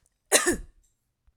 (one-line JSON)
{"cough_length": "1.4 s", "cough_amplitude": 22224, "cough_signal_mean_std_ratio": 0.33, "survey_phase": "alpha (2021-03-01 to 2021-08-12)", "age": "18-44", "gender": "Female", "wearing_mask": "No", "symptom_none": true, "symptom_onset": "3 days", "smoker_status": "Never smoked", "respiratory_condition_asthma": false, "respiratory_condition_other": false, "recruitment_source": "REACT", "submission_delay": "2 days", "covid_test_result": "Negative", "covid_test_method": "RT-qPCR"}